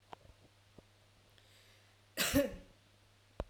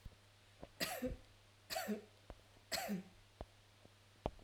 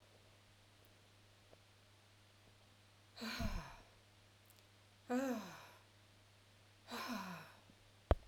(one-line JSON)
{"cough_length": "3.5 s", "cough_amplitude": 3693, "cough_signal_mean_std_ratio": 0.3, "three_cough_length": "4.4 s", "three_cough_amplitude": 3012, "three_cough_signal_mean_std_ratio": 0.49, "exhalation_length": "8.3 s", "exhalation_amplitude": 6668, "exhalation_signal_mean_std_ratio": 0.36, "survey_phase": "beta (2021-08-13 to 2022-03-07)", "age": "45-64", "gender": "Female", "wearing_mask": "No", "symptom_none": true, "smoker_status": "Never smoked", "respiratory_condition_asthma": false, "respiratory_condition_other": false, "recruitment_source": "REACT", "submission_delay": "1 day", "covid_test_result": "Negative", "covid_test_method": "RT-qPCR"}